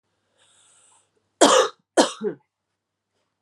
{"cough_length": "3.4 s", "cough_amplitude": 30270, "cough_signal_mean_std_ratio": 0.28, "survey_phase": "alpha (2021-03-01 to 2021-08-12)", "age": "18-44", "gender": "Female", "wearing_mask": "No", "symptom_cough_any": true, "symptom_shortness_of_breath": true, "symptom_fatigue": true, "symptom_headache": true, "symptom_change_to_sense_of_smell_or_taste": true, "symptom_loss_of_taste": true, "smoker_status": "Ex-smoker", "respiratory_condition_asthma": false, "respiratory_condition_other": false, "recruitment_source": "Test and Trace", "submission_delay": "2 days", "covid_test_result": "Positive", "covid_test_method": "RT-qPCR", "covid_ct_value": 18.6, "covid_ct_gene": "ORF1ab gene", "covid_ct_mean": 19.0, "covid_viral_load": "570000 copies/ml", "covid_viral_load_category": "Low viral load (10K-1M copies/ml)"}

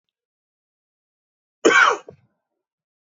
{"cough_length": "3.2 s", "cough_amplitude": 24968, "cough_signal_mean_std_ratio": 0.25, "survey_phase": "beta (2021-08-13 to 2022-03-07)", "age": "45-64", "gender": "Male", "wearing_mask": "No", "symptom_fatigue": true, "symptom_onset": "12 days", "smoker_status": "Never smoked", "respiratory_condition_asthma": false, "respiratory_condition_other": false, "recruitment_source": "REACT", "submission_delay": "1 day", "covid_test_result": "Negative", "covid_test_method": "RT-qPCR"}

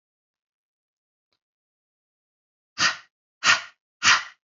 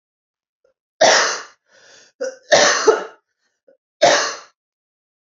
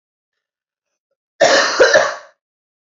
{"exhalation_length": "4.5 s", "exhalation_amplitude": 22387, "exhalation_signal_mean_std_ratio": 0.25, "three_cough_length": "5.2 s", "three_cough_amplitude": 32767, "three_cough_signal_mean_std_ratio": 0.39, "cough_length": "2.9 s", "cough_amplitude": 29818, "cough_signal_mean_std_ratio": 0.4, "survey_phase": "alpha (2021-03-01 to 2021-08-12)", "age": "18-44", "gender": "Female", "wearing_mask": "No", "symptom_new_continuous_cough": true, "symptom_fatigue": true, "symptom_fever_high_temperature": true, "symptom_headache": true, "symptom_onset": "4 days", "smoker_status": "Never smoked", "respiratory_condition_asthma": false, "respiratory_condition_other": false, "recruitment_source": "Test and Trace", "submission_delay": "2 days", "covid_test_result": "Positive", "covid_test_method": "RT-qPCR"}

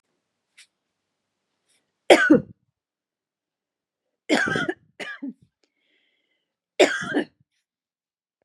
{"three_cough_length": "8.4 s", "three_cough_amplitude": 32768, "three_cough_signal_mean_std_ratio": 0.25, "survey_phase": "beta (2021-08-13 to 2022-03-07)", "age": "18-44", "gender": "Female", "wearing_mask": "No", "symptom_none": true, "symptom_onset": "6 days", "smoker_status": "Never smoked", "respiratory_condition_asthma": false, "respiratory_condition_other": false, "recruitment_source": "REACT", "submission_delay": "7 days", "covid_test_result": "Negative", "covid_test_method": "RT-qPCR", "influenza_a_test_result": "Negative", "influenza_b_test_result": "Negative"}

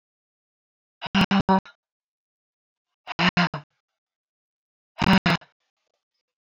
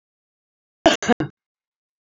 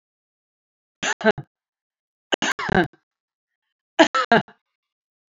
{"exhalation_length": "6.4 s", "exhalation_amplitude": 18642, "exhalation_signal_mean_std_ratio": 0.29, "cough_length": "2.1 s", "cough_amplitude": 26955, "cough_signal_mean_std_ratio": 0.23, "three_cough_length": "5.3 s", "three_cough_amplitude": 28118, "three_cough_signal_mean_std_ratio": 0.28, "survey_phase": "beta (2021-08-13 to 2022-03-07)", "age": "45-64", "gender": "Female", "wearing_mask": "No", "symptom_cough_any": true, "symptom_runny_or_blocked_nose": true, "symptom_sore_throat": true, "symptom_other": true, "symptom_onset": "12 days", "smoker_status": "Never smoked", "respiratory_condition_asthma": false, "respiratory_condition_other": false, "recruitment_source": "REACT", "submission_delay": "1 day", "covid_test_result": "Negative", "covid_test_method": "RT-qPCR", "influenza_a_test_result": "Unknown/Void", "influenza_b_test_result": "Unknown/Void"}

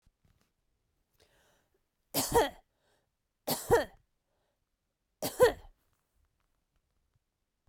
{"three_cough_length": "7.7 s", "three_cough_amplitude": 9306, "three_cough_signal_mean_std_ratio": 0.24, "survey_phase": "beta (2021-08-13 to 2022-03-07)", "age": "45-64", "gender": "Female", "wearing_mask": "No", "symptom_cough_any": true, "symptom_runny_or_blocked_nose": true, "symptom_shortness_of_breath": true, "symptom_abdominal_pain": true, "symptom_fatigue": true, "symptom_fever_high_temperature": true, "symptom_headache": true, "symptom_other": true, "smoker_status": "Never smoked", "respiratory_condition_asthma": false, "respiratory_condition_other": false, "recruitment_source": "Test and Trace", "submission_delay": "1 day", "covid_test_result": "Positive", "covid_test_method": "LFT"}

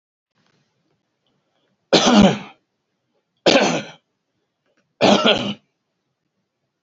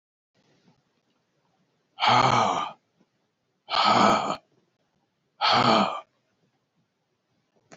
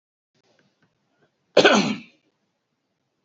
{"three_cough_length": "6.8 s", "three_cough_amplitude": 30118, "three_cough_signal_mean_std_ratio": 0.33, "exhalation_length": "7.8 s", "exhalation_amplitude": 17497, "exhalation_signal_mean_std_ratio": 0.4, "cough_length": "3.2 s", "cough_amplitude": 27037, "cough_signal_mean_std_ratio": 0.25, "survey_phase": "beta (2021-08-13 to 2022-03-07)", "age": "65+", "gender": "Male", "wearing_mask": "No", "symptom_none": true, "smoker_status": "Never smoked", "respiratory_condition_asthma": false, "respiratory_condition_other": false, "recruitment_source": "REACT", "submission_delay": "0 days", "covid_test_result": "Negative", "covid_test_method": "RT-qPCR", "influenza_a_test_result": "Negative", "influenza_b_test_result": "Negative"}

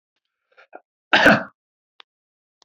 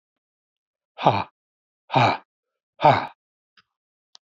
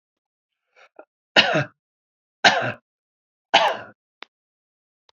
{"cough_length": "2.6 s", "cough_amplitude": 27723, "cough_signal_mean_std_ratio": 0.25, "exhalation_length": "4.3 s", "exhalation_amplitude": 27337, "exhalation_signal_mean_std_ratio": 0.28, "three_cough_length": "5.1 s", "three_cough_amplitude": 31861, "three_cough_signal_mean_std_ratio": 0.28, "survey_phase": "beta (2021-08-13 to 2022-03-07)", "age": "65+", "gender": "Male", "wearing_mask": "No", "symptom_none": true, "smoker_status": "Ex-smoker", "respiratory_condition_asthma": false, "respiratory_condition_other": false, "recruitment_source": "REACT", "submission_delay": "2 days", "covid_test_result": "Negative", "covid_test_method": "RT-qPCR", "influenza_a_test_result": "Negative", "influenza_b_test_result": "Negative"}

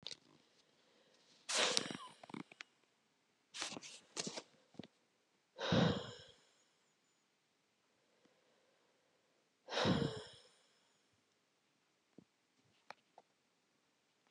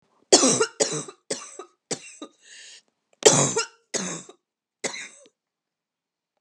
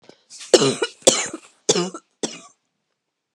{"exhalation_length": "14.3 s", "exhalation_amplitude": 10714, "exhalation_signal_mean_std_ratio": 0.29, "three_cough_length": "6.4 s", "three_cough_amplitude": 32713, "three_cough_signal_mean_std_ratio": 0.33, "cough_length": "3.3 s", "cough_amplitude": 32768, "cough_signal_mean_std_ratio": 0.34, "survey_phase": "beta (2021-08-13 to 2022-03-07)", "age": "18-44", "gender": "Female", "wearing_mask": "No", "symptom_cough_any": true, "symptom_shortness_of_breath": true, "symptom_sore_throat": true, "symptom_diarrhoea": true, "symptom_fatigue": true, "symptom_headache": true, "symptom_change_to_sense_of_smell_or_taste": true, "symptom_other": true, "symptom_onset": "4 days", "smoker_status": "Current smoker (1 to 10 cigarettes per day)", "respiratory_condition_asthma": false, "respiratory_condition_other": false, "recruitment_source": "Test and Trace", "submission_delay": "2 days", "covid_test_result": "Positive", "covid_test_method": "RT-qPCR", "covid_ct_value": 34.3, "covid_ct_gene": "ORF1ab gene", "covid_ct_mean": 35.1, "covid_viral_load": "3 copies/ml", "covid_viral_load_category": "Minimal viral load (< 10K copies/ml)"}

